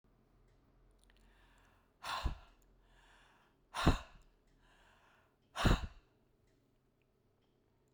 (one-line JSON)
{"exhalation_length": "7.9 s", "exhalation_amplitude": 5251, "exhalation_signal_mean_std_ratio": 0.24, "survey_phase": "beta (2021-08-13 to 2022-03-07)", "age": "65+", "gender": "Female", "wearing_mask": "No", "symptom_none": true, "smoker_status": "Ex-smoker", "respiratory_condition_asthma": false, "respiratory_condition_other": false, "recruitment_source": "REACT", "submission_delay": "2 days", "covid_test_result": "Negative", "covid_test_method": "RT-qPCR"}